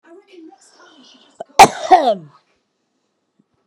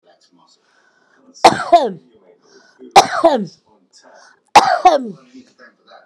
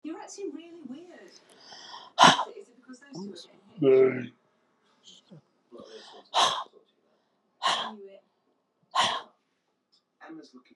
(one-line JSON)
{"cough_length": "3.7 s", "cough_amplitude": 32768, "cough_signal_mean_std_ratio": 0.25, "three_cough_length": "6.1 s", "three_cough_amplitude": 32768, "three_cough_signal_mean_std_ratio": 0.33, "exhalation_length": "10.8 s", "exhalation_amplitude": 25978, "exhalation_signal_mean_std_ratio": 0.32, "survey_phase": "beta (2021-08-13 to 2022-03-07)", "age": "45-64", "gender": "Female", "wearing_mask": "No", "symptom_none": true, "symptom_onset": "12 days", "smoker_status": "Current smoker (11 or more cigarettes per day)", "respiratory_condition_asthma": false, "respiratory_condition_other": false, "recruitment_source": "REACT", "submission_delay": "6 days", "covid_test_result": "Negative", "covid_test_method": "RT-qPCR"}